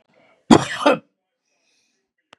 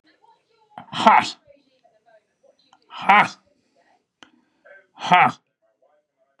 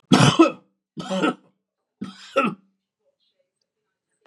{"cough_length": "2.4 s", "cough_amplitude": 32768, "cough_signal_mean_std_ratio": 0.25, "exhalation_length": "6.4 s", "exhalation_amplitude": 32767, "exhalation_signal_mean_std_ratio": 0.27, "three_cough_length": "4.3 s", "three_cough_amplitude": 30590, "three_cough_signal_mean_std_ratio": 0.33, "survey_phase": "beta (2021-08-13 to 2022-03-07)", "age": "45-64", "gender": "Male", "wearing_mask": "No", "symptom_none": true, "smoker_status": "Never smoked", "respiratory_condition_asthma": false, "respiratory_condition_other": false, "recruitment_source": "REACT", "submission_delay": "1 day", "covid_test_result": "Negative", "covid_test_method": "RT-qPCR", "influenza_a_test_result": "Negative", "influenza_b_test_result": "Negative"}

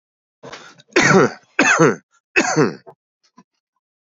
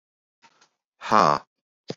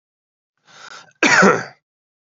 {"three_cough_length": "4.0 s", "three_cough_amplitude": 31925, "three_cough_signal_mean_std_ratio": 0.42, "exhalation_length": "2.0 s", "exhalation_amplitude": 26800, "exhalation_signal_mean_std_ratio": 0.25, "cough_length": "2.2 s", "cough_amplitude": 32574, "cough_signal_mean_std_ratio": 0.35, "survey_phase": "beta (2021-08-13 to 2022-03-07)", "age": "18-44", "gender": "Male", "wearing_mask": "No", "symptom_cough_any": true, "symptom_runny_or_blocked_nose": true, "symptom_sore_throat": true, "symptom_change_to_sense_of_smell_or_taste": true, "smoker_status": "Never smoked", "respiratory_condition_asthma": false, "respiratory_condition_other": false, "recruitment_source": "Test and Trace", "submission_delay": "73 days", "covid_test_result": "Negative", "covid_test_method": "RT-qPCR"}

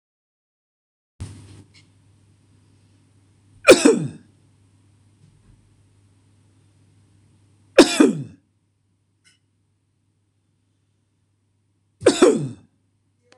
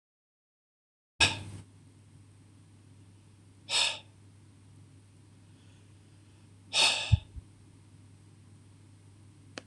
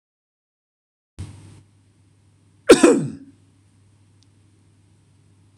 {"three_cough_length": "13.4 s", "three_cough_amplitude": 26028, "three_cough_signal_mean_std_ratio": 0.21, "exhalation_length": "9.7 s", "exhalation_amplitude": 11123, "exhalation_signal_mean_std_ratio": 0.29, "cough_length": "5.6 s", "cough_amplitude": 26028, "cough_signal_mean_std_ratio": 0.2, "survey_phase": "beta (2021-08-13 to 2022-03-07)", "age": "45-64", "gender": "Male", "wearing_mask": "No", "symptom_none": true, "symptom_onset": "11 days", "smoker_status": "Never smoked", "respiratory_condition_asthma": false, "respiratory_condition_other": false, "recruitment_source": "REACT", "submission_delay": "1 day", "covid_test_result": "Negative", "covid_test_method": "RT-qPCR", "influenza_a_test_result": "Negative", "influenza_b_test_result": "Negative"}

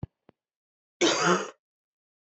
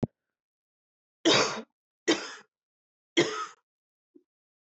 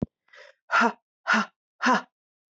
{"cough_length": "2.3 s", "cough_amplitude": 10517, "cough_signal_mean_std_ratio": 0.35, "three_cough_length": "4.7 s", "three_cough_amplitude": 11991, "three_cough_signal_mean_std_ratio": 0.3, "exhalation_length": "2.6 s", "exhalation_amplitude": 13184, "exhalation_signal_mean_std_ratio": 0.39, "survey_phase": "beta (2021-08-13 to 2022-03-07)", "age": "45-64", "gender": "Female", "wearing_mask": "No", "symptom_cough_any": true, "symptom_runny_or_blocked_nose": true, "symptom_fatigue": true, "symptom_headache": true, "symptom_onset": "5 days", "smoker_status": "Ex-smoker", "respiratory_condition_asthma": false, "respiratory_condition_other": false, "recruitment_source": "Test and Trace", "submission_delay": "1 day", "covid_test_result": "Positive", "covid_test_method": "RT-qPCR", "covid_ct_value": 16.6, "covid_ct_gene": "ORF1ab gene"}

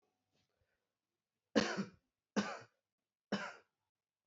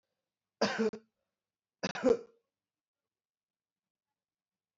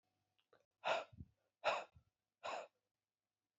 {"three_cough_length": "4.3 s", "three_cough_amplitude": 4960, "three_cough_signal_mean_std_ratio": 0.27, "cough_length": "4.8 s", "cough_amplitude": 5266, "cough_signal_mean_std_ratio": 0.25, "exhalation_length": "3.6 s", "exhalation_amplitude": 2091, "exhalation_signal_mean_std_ratio": 0.32, "survey_phase": "beta (2021-08-13 to 2022-03-07)", "age": "18-44", "gender": "Male", "wearing_mask": "No", "symptom_runny_or_blocked_nose": true, "symptom_sore_throat": true, "symptom_fatigue": true, "symptom_headache": true, "symptom_change_to_sense_of_smell_or_taste": true, "symptom_loss_of_taste": true, "symptom_onset": "5 days", "smoker_status": "Never smoked", "respiratory_condition_asthma": false, "respiratory_condition_other": false, "recruitment_source": "Test and Trace", "submission_delay": "1 day", "covid_test_result": "Positive", "covid_test_method": "RT-qPCR", "covid_ct_value": 21.0, "covid_ct_gene": "ORF1ab gene", "covid_ct_mean": 21.6, "covid_viral_load": "84000 copies/ml", "covid_viral_load_category": "Low viral load (10K-1M copies/ml)"}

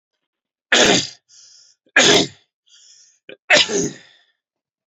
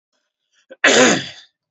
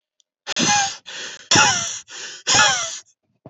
{"three_cough_length": "4.9 s", "three_cough_amplitude": 31192, "three_cough_signal_mean_std_ratio": 0.36, "cough_length": "1.7 s", "cough_amplitude": 28852, "cough_signal_mean_std_ratio": 0.4, "exhalation_length": "3.5 s", "exhalation_amplitude": 28739, "exhalation_signal_mean_std_ratio": 0.54, "survey_phase": "beta (2021-08-13 to 2022-03-07)", "age": "18-44", "gender": "Male", "wearing_mask": "No", "symptom_headache": true, "symptom_other": true, "smoker_status": "Never smoked", "respiratory_condition_asthma": true, "respiratory_condition_other": false, "recruitment_source": "REACT", "submission_delay": "1 day", "covid_test_result": "Negative", "covid_test_method": "RT-qPCR", "influenza_a_test_result": "Unknown/Void", "influenza_b_test_result": "Unknown/Void"}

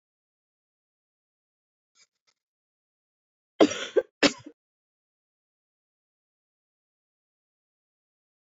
{"cough_length": "8.4 s", "cough_amplitude": 20022, "cough_signal_mean_std_ratio": 0.13, "survey_phase": "beta (2021-08-13 to 2022-03-07)", "age": "45-64", "gender": "Female", "wearing_mask": "No", "symptom_cough_any": true, "symptom_runny_or_blocked_nose": true, "symptom_fatigue": true, "symptom_headache": true, "symptom_change_to_sense_of_smell_or_taste": true, "smoker_status": "Never smoked", "respiratory_condition_asthma": false, "respiratory_condition_other": false, "recruitment_source": "Test and Trace", "submission_delay": "3 days", "covid_test_result": "Positive", "covid_test_method": "LFT"}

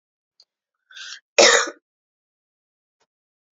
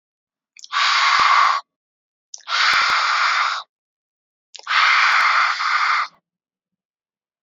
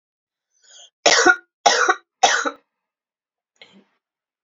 {"cough_length": "3.6 s", "cough_amplitude": 30488, "cough_signal_mean_std_ratio": 0.22, "exhalation_length": "7.4 s", "exhalation_amplitude": 24760, "exhalation_signal_mean_std_ratio": 0.61, "three_cough_length": "4.4 s", "three_cough_amplitude": 30432, "three_cough_signal_mean_std_ratio": 0.33, "survey_phase": "beta (2021-08-13 to 2022-03-07)", "age": "18-44", "gender": "Female", "wearing_mask": "No", "symptom_cough_any": true, "symptom_runny_or_blocked_nose": true, "symptom_sore_throat": true, "symptom_onset": "3 days", "smoker_status": "Never smoked", "respiratory_condition_asthma": false, "respiratory_condition_other": false, "recruitment_source": "Test and Trace", "submission_delay": "2 days", "covid_test_result": "Positive", "covid_test_method": "RT-qPCR", "covid_ct_value": 19.4, "covid_ct_gene": "N gene"}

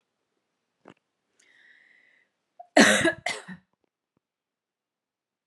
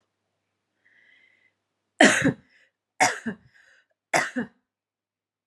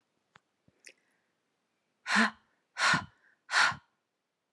{"cough_length": "5.5 s", "cough_amplitude": 22288, "cough_signal_mean_std_ratio": 0.22, "three_cough_length": "5.5 s", "three_cough_amplitude": 29397, "three_cough_signal_mean_std_ratio": 0.27, "exhalation_length": "4.5 s", "exhalation_amplitude": 8189, "exhalation_signal_mean_std_ratio": 0.31, "survey_phase": "alpha (2021-03-01 to 2021-08-12)", "age": "45-64", "gender": "Female", "wearing_mask": "No", "symptom_none": true, "smoker_status": "Never smoked", "respiratory_condition_asthma": false, "respiratory_condition_other": false, "recruitment_source": "REACT", "submission_delay": "1 day", "covid_test_result": "Negative", "covid_test_method": "RT-qPCR"}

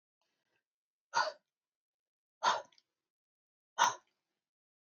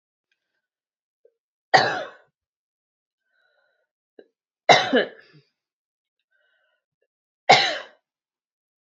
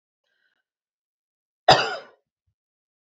{"exhalation_length": "4.9 s", "exhalation_amplitude": 6046, "exhalation_signal_mean_std_ratio": 0.23, "three_cough_length": "8.9 s", "three_cough_amplitude": 29122, "three_cough_signal_mean_std_ratio": 0.22, "cough_length": "3.1 s", "cough_amplitude": 28190, "cough_signal_mean_std_ratio": 0.19, "survey_phase": "beta (2021-08-13 to 2022-03-07)", "age": "18-44", "gender": "Female", "wearing_mask": "No", "symptom_cough_any": true, "symptom_runny_or_blocked_nose": true, "symptom_sore_throat": true, "symptom_fatigue": true, "symptom_loss_of_taste": true, "symptom_onset": "3 days", "smoker_status": "Ex-smoker", "respiratory_condition_asthma": false, "respiratory_condition_other": false, "recruitment_source": "Test and Trace", "submission_delay": "1 day", "covid_test_result": "Positive", "covid_test_method": "RT-qPCR", "covid_ct_value": 25.1, "covid_ct_gene": "ORF1ab gene", "covid_ct_mean": 25.6, "covid_viral_load": "4100 copies/ml", "covid_viral_load_category": "Minimal viral load (< 10K copies/ml)"}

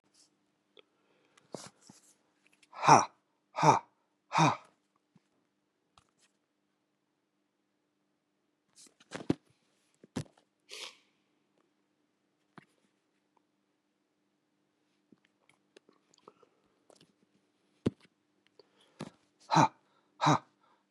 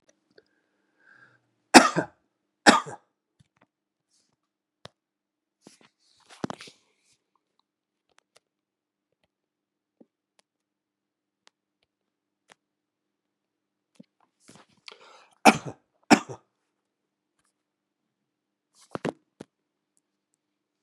{"exhalation_length": "20.9 s", "exhalation_amplitude": 15480, "exhalation_signal_mean_std_ratio": 0.18, "cough_length": "20.8 s", "cough_amplitude": 32768, "cough_signal_mean_std_ratio": 0.12, "survey_phase": "beta (2021-08-13 to 2022-03-07)", "age": "65+", "gender": "Male", "wearing_mask": "No", "symptom_cough_any": true, "symptom_runny_or_blocked_nose": true, "symptom_sore_throat": true, "symptom_fatigue": true, "symptom_headache": true, "smoker_status": "Ex-smoker", "respiratory_condition_asthma": false, "respiratory_condition_other": false, "recruitment_source": "Test and Trace", "submission_delay": "1 day", "covid_test_result": "Positive", "covid_test_method": "RT-qPCR", "covid_ct_value": 21.4, "covid_ct_gene": "ORF1ab gene"}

